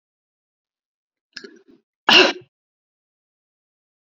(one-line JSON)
{"cough_length": "4.1 s", "cough_amplitude": 28307, "cough_signal_mean_std_ratio": 0.19, "survey_phase": "beta (2021-08-13 to 2022-03-07)", "age": "65+", "gender": "Female", "wearing_mask": "No", "symptom_none": true, "smoker_status": "Never smoked", "respiratory_condition_asthma": false, "respiratory_condition_other": false, "recruitment_source": "REACT", "submission_delay": "1 day", "covid_test_result": "Negative", "covid_test_method": "RT-qPCR", "influenza_a_test_result": "Negative", "influenza_b_test_result": "Negative"}